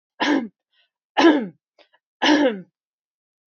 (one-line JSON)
{"three_cough_length": "3.5 s", "three_cough_amplitude": 22569, "three_cough_signal_mean_std_ratio": 0.4, "survey_phase": "beta (2021-08-13 to 2022-03-07)", "age": "45-64", "gender": "Female", "wearing_mask": "No", "symptom_none": true, "smoker_status": "Never smoked", "respiratory_condition_asthma": false, "respiratory_condition_other": false, "recruitment_source": "REACT", "submission_delay": "3 days", "covid_test_result": "Negative", "covid_test_method": "RT-qPCR"}